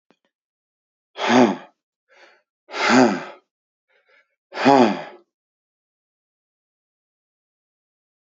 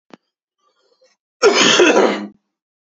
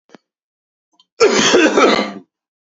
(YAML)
exhalation_length: 8.3 s
exhalation_amplitude: 28769
exhalation_signal_mean_std_ratio: 0.29
three_cough_length: 3.0 s
three_cough_amplitude: 32767
three_cough_signal_mean_std_ratio: 0.43
cough_length: 2.6 s
cough_amplitude: 30874
cough_signal_mean_std_ratio: 0.5
survey_phase: beta (2021-08-13 to 2022-03-07)
age: 18-44
gender: Male
wearing_mask: 'No'
symptom_cough_any: true
symptom_new_continuous_cough: true
symptom_runny_or_blocked_nose: true
symptom_sore_throat: true
symptom_fatigue: true
symptom_fever_high_temperature: true
symptom_headache: true
symptom_change_to_sense_of_smell_or_taste: true
symptom_loss_of_taste: true
symptom_other: true
symptom_onset: 3 days
smoker_status: Never smoked
respiratory_condition_asthma: false
respiratory_condition_other: false
recruitment_source: Test and Trace
submission_delay: 1 day
covid_test_result: Positive
covid_test_method: ePCR